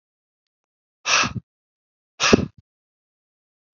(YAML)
exhalation_length: 3.8 s
exhalation_amplitude: 32768
exhalation_signal_mean_std_ratio: 0.26
survey_phase: beta (2021-08-13 to 2022-03-07)
age: 45-64
gender: Male
wearing_mask: 'No'
symptom_fatigue: true
symptom_headache: true
symptom_change_to_sense_of_smell_or_taste: true
symptom_loss_of_taste: true
symptom_onset: 4 days
smoker_status: Never smoked
respiratory_condition_asthma: false
respiratory_condition_other: false
recruitment_source: Test and Trace
submission_delay: 2 days
covid_test_result: Positive
covid_test_method: RT-qPCR
covid_ct_value: 17.2
covid_ct_gene: ORF1ab gene
covid_ct_mean: 17.7
covid_viral_load: 1600000 copies/ml
covid_viral_load_category: High viral load (>1M copies/ml)